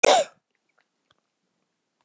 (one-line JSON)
{"cough_length": "2.0 s", "cough_amplitude": 28918, "cough_signal_mean_std_ratio": 0.24, "survey_phase": "beta (2021-08-13 to 2022-03-07)", "age": "65+", "gender": "Male", "wearing_mask": "No", "symptom_cough_any": true, "smoker_status": "Never smoked", "respiratory_condition_asthma": false, "respiratory_condition_other": false, "recruitment_source": "Test and Trace", "submission_delay": "2 days", "covid_test_result": "Positive", "covid_test_method": "RT-qPCR", "covid_ct_value": 16.8, "covid_ct_gene": "ORF1ab gene", "covid_ct_mean": 17.2, "covid_viral_load": "2400000 copies/ml", "covid_viral_load_category": "High viral load (>1M copies/ml)"}